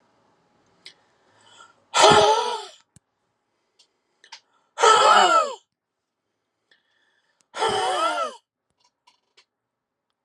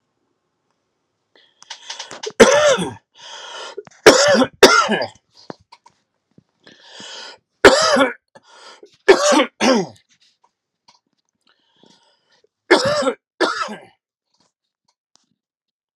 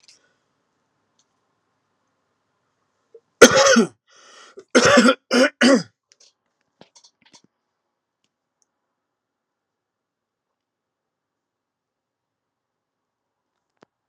{"exhalation_length": "10.2 s", "exhalation_amplitude": 30890, "exhalation_signal_mean_std_ratio": 0.34, "three_cough_length": "16.0 s", "three_cough_amplitude": 32768, "three_cough_signal_mean_std_ratio": 0.34, "cough_length": "14.1 s", "cough_amplitude": 32768, "cough_signal_mean_std_ratio": 0.22, "survey_phase": "alpha (2021-03-01 to 2021-08-12)", "age": "45-64", "gender": "Male", "wearing_mask": "No", "symptom_cough_any": true, "smoker_status": "Never smoked", "respiratory_condition_asthma": false, "respiratory_condition_other": false, "recruitment_source": "Test and Trace", "submission_delay": "2 days", "covid_test_result": "Positive", "covid_test_method": "RT-qPCR"}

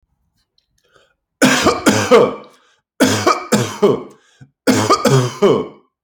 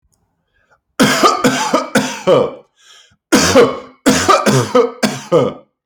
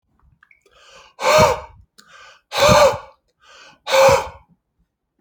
{"three_cough_length": "6.0 s", "three_cough_amplitude": 32236, "three_cough_signal_mean_std_ratio": 0.54, "cough_length": "5.9 s", "cough_amplitude": 32767, "cough_signal_mean_std_ratio": 0.6, "exhalation_length": "5.2 s", "exhalation_amplitude": 28433, "exhalation_signal_mean_std_ratio": 0.4, "survey_phase": "alpha (2021-03-01 to 2021-08-12)", "age": "18-44", "gender": "Male", "wearing_mask": "No", "symptom_none": true, "smoker_status": "Never smoked", "respiratory_condition_asthma": false, "respiratory_condition_other": false, "recruitment_source": "REACT", "submission_delay": "4 days", "covid_test_result": "Negative", "covid_test_method": "RT-qPCR"}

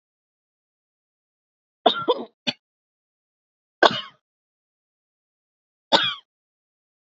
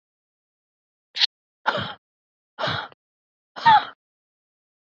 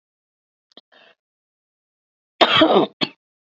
{"three_cough_length": "7.1 s", "three_cough_amplitude": 27726, "three_cough_signal_mean_std_ratio": 0.2, "exhalation_length": "4.9 s", "exhalation_amplitude": 22036, "exhalation_signal_mean_std_ratio": 0.26, "cough_length": "3.6 s", "cough_amplitude": 28046, "cough_signal_mean_std_ratio": 0.29, "survey_phase": "beta (2021-08-13 to 2022-03-07)", "age": "45-64", "gender": "Female", "wearing_mask": "No", "symptom_cough_any": true, "smoker_status": "Never smoked", "respiratory_condition_asthma": true, "respiratory_condition_other": false, "recruitment_source": "Test and Trace", "submission_delay": "2 days", "covid_test_result": "Negative", "covid_test_method": "RT-qPCR"}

